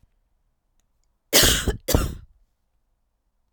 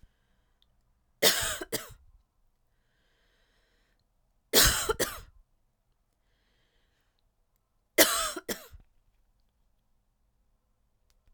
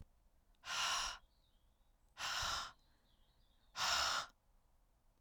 {"cough_length": "3.5 s", "cough_amplitude": 27937, "cough_signal_mean_std_ratio": 0.32, "three_cough_length": "11.3 s", "three_cough_amplitude": 18925, "three_cough_signal_mean_std_ratio": 0.25, "exhalation_length": "5.2 s", "exhalation_amplitude": 2055, "exhalation_signal_mean_std_ratio": 0.47, "survey_phase": "beta (2021-08-13 to 2022-03-07)", "age": "18-44", "gender": "Female", "wearing_mask": "No", "symptom_cough_any": true, "symptom_runny_or_blocked_nose": true, "symptom_sore_throat": true, "symptom_fatigue": true, "symptom_fever_high_temperature": true, "symptom_headache": true, "symptom_other": true, "symptom_onset": "5 days", "smoker_status": "Never smoked", "respiratory_condition_asthma": false, "respiratory_condition_other": false, "recruitment_source": "Test and Trace", "submission_delay": "1 day", "covid_test_result": "Positive", "covid_test_method": "RT-qPCR", "covid_ct_value": 28.4, "covid_ct_gene": "ORF1ab gene", "covid_ct_mean": 29.0, "covid_viral_load": "300 copies/ml", "covid_viral_load_category": "Minimal viral load (< 10K copies/ml)"}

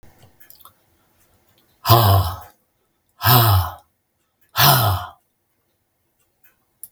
{"exhalation_length": "6.9 s", "exhalation_amplitude": 32768, "exhalation_signal_mean_std_ratio": 0.37, "survey_phase": "beta (2021-08-13 to 2022-03-07)", "age": "65+", "gender": "Male", "wearing_mask": "No", "symptom_none": true, "smoker_status": "Never smoked", "respiratory_condition_asthma": false, "respiratory_condition_other": false, "recruitment_source": "REACT", "submission_delay": "2 days", "covid_test_result": "Negative", "covid_test_method": "RT-qPCR", "influenza_a_test_result": "Negative", "influenza_b_test_result": "Negative"}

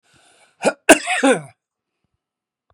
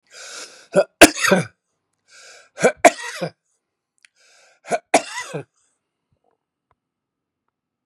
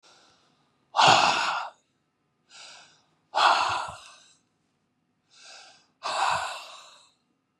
{"cough_length": "2.7 s", "cough_amplitude": 32768, "cough_signal_mean_std_ratio": 0.29, "three_cough_length": "7.9 s", "three_cough_amplitude": 32768, "three_cough_signal_mean_std_ratio": 0.24, "exhalation_length": "7.6 s", "exhalation_amplitude": 22258, "exhalation_signal_mean_std_ratio": 0.37, "survey_phase": "beta (2021-08-13 to 2022-03-07)", "age": "65+", "gender": "Male", "wearing_mask": "No", "symptom_none": true, "smoker_status": "Ex-smoker", "respiratory_condition_asthma": false, "respiratory_condition_other": true, "recruitment_source": "REACT", "submission_delay": "1 day", "covid_test_result": "Negative", "covid_test_method": "RT-qPCR", "influenza_a_test_result": "Negative", "influenza_b_test_result": "Negative"}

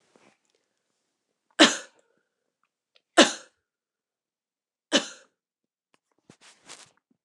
{"three_cough_length": "7.2 s", "three_cough_amplitude": 28554, "three_cough_signal_mean_std_ratio": 0.17, "survey_phase": "beta (2021-08-13 to 2022-03-07)", "age": "18-44", "gender": "Female", "wearing_mask": "No", "symptom_none": true, "smoker_status": "Never smoked", "respiratory_condition_asthma": false, "respiratory_condition_other": false, "recruitment_source": "REACT", "submission_delay": "1 day", "covid_test_result": "Negative", "covid_test_method": "RT-qPCR", "influenza_a_test_result": "Negative", "influenza_b_test_result": "Negative"}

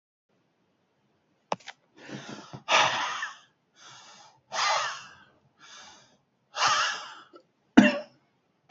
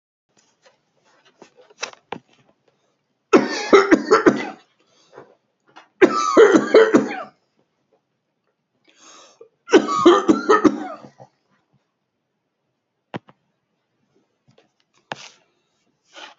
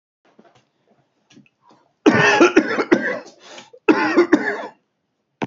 {"exhalation_length": "8.7 s", "exhalation_amplitude": 26960, "exhalation_signal_mean_std_ratio": 0.33, "three_cough_length": "16.4 s", "three_cough_amplitude": 32190, "three_cough_signal_mean_std_ratio": 0.31, "cough_length": "5.5 s", "cough_amplitude": 32767, "cough_signal_mean_std_ratio": 0.42, "survey_phase": "alpha (2021-03-01 to 2021-08-12)", "age": "45-64", "gender": "Male", "wearing_mask": "No", "symptom_headache": true, "smoker_status": "Ex-smoker", "respiratory_condition_asthma": true, "respiratory_condition_other": false, "recruitment_source": "Test and Trace", "submission_delay": "2 days", "covid_test_result": "Positive", "covid_test_method": "RT-qPCR", "covid_ct_value": 23.3, "covid_ct_gene": "ORF1ab gene", "covid_ct_mean": 24.2, "covid_viral_load": "12000 copies/ml", "covid_viral_load_category": "Low viral load (10K-1M copies/ml)"}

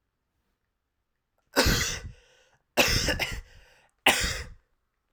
{"three_cough_length": "5.1 s", "three_cough_amplitude": 19730, "three_cough_signal_mean_std_ratio": 0.4, "survey_phase": "alpha (2021-03-01 to 2021-08-12)", "age": "18-44", "gender": "Male", "wearing_mask": "No", "symptom_cough_any": true, "symptom_change_to_sense_of_smell_or_taste": true, "symptom_onset": "3 days", "smoker_status": "Never smoked", "respiratory_condition_asthma": false, "respiratory_condition_other": false, "recruitment_source": "Test and Trace", "submission_delay": "1 day", "covid_test_result": "Positive", "covid_test_method": "RT-qPCR"}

